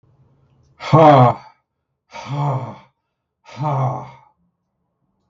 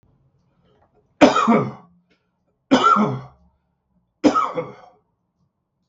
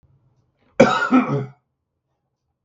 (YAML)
exhalation_length: 5.3 s
exhalation_amplitude: 32768
exhalation_signal_mean_std_ratio: 0.36
three_cough_length: 5.9 s
three_cough_amplitude: 32768
three_cough_signal_mean_std_ratio: 0.36
cough_length: 2.6 s
cough_amplitude: 32768
cough_signal_mean_std_ratio: 0.35
survey_phase: beta (2021-08-13 to 2022-03-07)
age: 65+
gender: Male
wearing_mask: 'No'
symptom_none: true
smoker_status: Never smoked
respiratory_condition_asthma: false
respiratory_condition_other: false
recruitment_source: REACT
submission_delay: 3 days
covid_test_result: Negative
covid_test_method: RT-qPCR
influenza_a_test_result: Negative
influenza_b_test_result: Negative